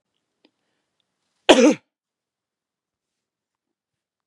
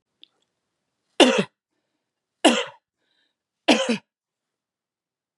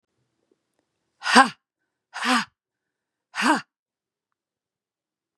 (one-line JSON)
{"cough_length": "4.3 s", "cough_amplitude": 32767, "cough_signal_mean_std_ratio": 0.18, "three_cough_length": "5.4 s", "three_cough_amplitude": 32767, "three_cough_signal_mean_std_ratio": 0.25, "exhalation_length": "5.4 s", "exhalation_amplitude": 32767, "exhalation_signal_mean_std_ratio": 0.25, "survey_phase": "beta (2021-08-13 to 2022-03-07)", "age": "18-44", "gender": "Female", "wearing_mask": "No", "symptom_runny_or_blocked_nose": true, "symptom_sore_throat": true, "symptom_onset": "3 days", "smoker_status": "Never smoked", "respiratory_condition_asthma": false, "respiratory_condition_other": false, "recruitment_source": "Test and Trace", "submission_delay": "2 days", "covid_test_result": "Negative", "covid_test_method": "RT-qPCR"}